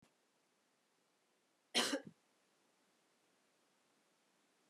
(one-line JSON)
{"cough_length": "4.7 s", "cough_amplitude": 2718, "cough_signal_mean_std_ratio": 0.2, "survey_phase": "beta (2021-08-13 to 2022-03-07)", "age": "65+", "gender": "Female", "wearing_mask": "No", "symptom_none": true, "symptom_onset": "5 days", "smoker_status": "Never smoked", "respiratory_condition_asthma": false, "respiratory_condition_other": false, "recruitment_source": "REACT", "submission_delay": "3 days", "covid_test_result": "Negative", "covid_test_method": "RT-qPCR", "influenza_a_test_result": "Negative", "influenza_b_test_result": "Negative"}